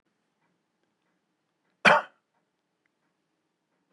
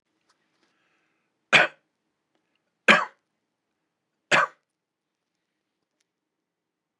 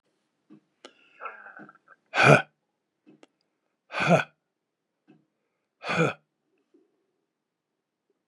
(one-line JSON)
{"cough_length": "3.9 s", "cough_amplitude": 19937, "cough_signal_mean_std_ratio": 0.16, "three_cough_length": "7.0 s", "three_cough_amplitude": 30682, "three_cough_signal_mean_std_ratio": 0.19, "exhalation_length": "8.3 s", "exhalation_amplitude": 25252, "exhalation_signal_mean_std_ratio": 0.23, "survey_phase": "beta (2021-08-13 to 2022-03-07)", "age": "65+", "gender": "Male", "wearing_mask": "No", "symptom_none": true, "smoker_status": "Ex-smoker", "respiratory_condition_asthma": false, "respiratory_condition_other": false, "recruitment_source": "REACT", "submission_delay": "3 days", "covid_test_result": "Negative", "covid_test_method": "RT-qPCR", "influenza_a_test_result": "Negative", "influenza_b_test_result": "Negative"}